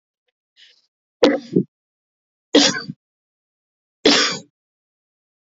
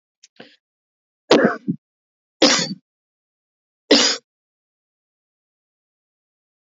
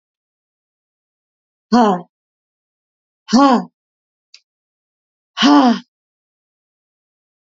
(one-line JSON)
{"three_cough_length": "5.5 s", "three_cough_amplitude": 32768, "three_cough_signal_mean_std_ratio": 0.3, "cough_length": "6.7 s", "cough_amplitude": 28795, "cough_signal_mean_std_ratio": 0.26, "exhalation_length": "7.4 s", "exhalation_amplitude": 29942, "exhalation_signal_mean_std_ratio": 0.29, "survey_phase": "alpha (2021-03-01 to 2021-08-12)", "age": "18-44", "gender": "Female", "wearing_mask": "No", "symptom_cough_any": true, "symptom_change_to_sense_of_smell_or_taste": true, "smoker_status": "Never smoked", "respiratory_condition_asthma": false, "respiratory_condition_other": false, "recruitment_source": "Test and Trace", "submission_delay": "2 days", "covid_test_result": "Positive", "covid_test_method": "RT-qPCR", "covid_ct_value": 15.3, "covid_ct_gene": "ORF1ab gene", "covid_ct_mean": 15.7, "covid_viral_load": "7000000 copies/ml", "covid_viral_load_category": "High viral load (>1M copies/ml)"}